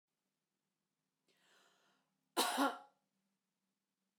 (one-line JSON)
{"cough_length": "4.2 s", "cough_amplitude": 2794, "cough_signal_mean_std_ratio": 0.23, "survey_phase": "beta (2021-08-13 to 2022-03-07)", "age": "45-64", "gender": "Female", "wearing_mask": "No", "symptom_runny_or_blocked_nose": true, "symptom_onset": "13 days", "smoker_status": "Never smoked", "respiratory_condition_asthma": false, "respiratory_condition_other": false, "recruitment_source": "REACT", "submission_delay": "1 day", "covid_test_result": "Negative", "covid_test_method": "RT-qPCR"}